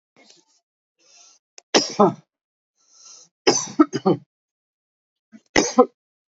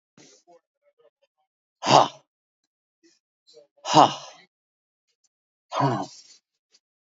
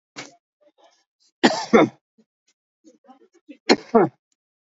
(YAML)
three_cough_length: 6.4 s
three_cough_amplitude: 28766
three_cough_signal_mean_std_ratio: 0.27
exhalation_length: 7.1 s
exhalation_amplitude: 28473
exhalation_signal_mean_std_ratio: 0.23
cough_length: 4.7 s
cough_amplitude: 27561
cough_signal_mean_std_ratio: 0.26
survey_phase: alpha (2021-03-01 to 2021-08-12)
age: 45-64
gender: Male
wearing_mask: 'No'
symptom_none: true
smoker_status: Never smoked
respiratory_condition_asthma: false
respiratory_condition_other: false
recruitment_source: REACT
submission_delay: 1 day
covid_test_result: Negative
covid_test_method: RT-qPCR